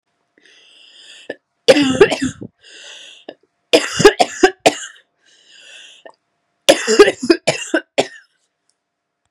{"three_cough_length": "9.3 s", "three_cough_amplitude": 32768, "three_cough_signal_mean_std_ratio": 0.33, "survey_phase": "beta (2021-08-13 to 2022-03-07)", "age": "18-44", "gender": "Female", "wearing_mask": "No", "symptom_cough_any": true, "symptom_runny_or_blocked_nose": true, "symptom_sore_throat": true, "symptom_fatigue": true, "symptom_headache": true, "symptom_change_to_sense_of_smell_or_taste": true, "smoker_status": "Never smoked", "respiratory_condition_asthma": true, "respiratory_condition_other": false, "recruitment_source": "Test and Trace", "submission_delay": "2 days", "covid_test_result": "Positive", "covid_test_method": "RT-qPCR", "covid_ct_value": 19.9, "covid_ct_gene": "ORF1ab gene", "covid_ct_mean": 20.3, "covid_viral_load": "230000 copies/ml", "covid_viral_load_category": "Low viral load (10K-1M copies/ml)"}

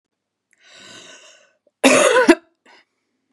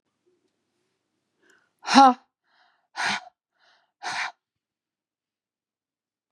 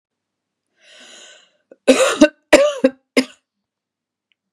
{"cough_length": "3.3 s", "cough_amplitude": 32767, "cough_signal_mean_std_ratio": 0.32, "exhalation_length": "6.3 s", "exhalation_amplitude": 31986, "exhalation_signal_mean_std_ratio": 0.2, "three_cough_length": "4.5 s", "three_cough_amplitude": 32768, "three_cough_signal_mean_std_ratio": 0.3, "survey_phase": "beta (2021-08-13 to 2022-03-07)", "age": "18-44", "gender": "Female", "wearing_mask": "No", "symptom_cough_any": true, "symptom_new_continuous_cough": true, "symptom_sore_throat": true, "symptom_diarrhoea": true, "symptom_headache": true, "symptom_onset": "2 days", "smoker_status": "Never smoked", "respiratory_condition_asthma": false, "respiratory_condition_other": false, "recruitment_source": "Test and Trace", "submission_delay": "1 day", "covid_test_result": "Positive", "covid_test_method": "RT-qPCR", "covid_ct_value": 29.5, "covid_ct_gene": "N gene"}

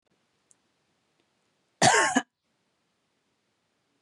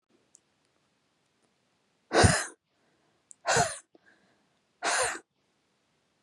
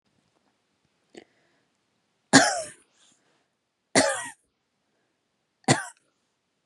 {"cough_length": "4.0 s", "cough_amplitude": 14424, "cough_signal_mean_std_ratio": 0.24, "exhalation_length": "6.2 s", "exhalation_amplitude": 16010, "exhalation_signal_mean_std_ratio": 0.29, "three_cough_length": "6.7 s", "three_cough_amplitude": 29264, "three_cough_signal_mean_std_ratio": 0.22, "survey_phase": "beta (2021-08-13 to 2022-03-07)", "age": "18-44", "gender": "Female", "wearing_mask": "No", "symptom_none": true, "smoker_status": "Never smoked", "respiratory_condition_asthma": false, "respiratory_condition_other": false, "recruitment_source": "REACT", "submission_delay": "1 day", "covid_test_result": "Negative", "covid_test_method": "RT-qPCR", "influenza_a_test_result": "Negative", "influenza_b_test_result": "Negative"}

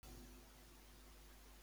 {"exhalation_length": "1.6 s", "exhalation_amplitude": 178, "exhalation_signal_mean_std_ratio": 1.28, "survey_phase": "beta (2021-08-13 to 2022-03-07)", "age": "45-64", "gender": "Male", "wearing_mask": "No", "symptom_none": true, "smoker_status": "Never smoked", "respiratory_condition_asthma": false, "respiratory_condition_other": false, "recruitment_source": "REACT", "submission_delay": "2 days", "covid_test_result": "Negative", "covid_test_method": "RT-qPCR", "influenza_a_test_result": "Negative", "influenza_b_test_result": "Negative"}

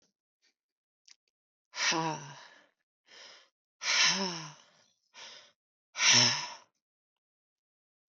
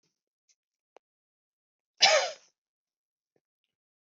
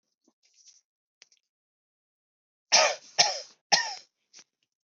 {"exhalation_length": "8.1 s", "exhalation_amplitude": 12246, "exhalation_signal_mean_std_ratio": 0.33, "cough_length": "4.1 s", "cough_amplitude": 17251, "cough_signal_mean_std_ratio": 0.2, "three_cough_length": "4.9 s", "three_cough_amplitude": 16687, "three_cough_signal_mean_std_ratio": 0.25, "survey_phase": "beta (2021-08-13 to 2022-03-07)", "age": "45-64", "gender": "Female", "wearing_mask": "No", "symptom_runny_or_blocked_nose": true, "symptom_shortness_of_breath": true, "symptom_fatigue": true, "smoker_status": "Ex-smoker", "respiratory_condition_asthma": false, "respiratory_condition_other": false, "recruitment_source": "REACT", "submission_delay": "6 days", "covid_test_result": "Negative", "covid_test_method": "RT-qPCR", "influenza_a_test_result": "Unknown/Void", "influenza_b_test_result": "Unknown/Void"}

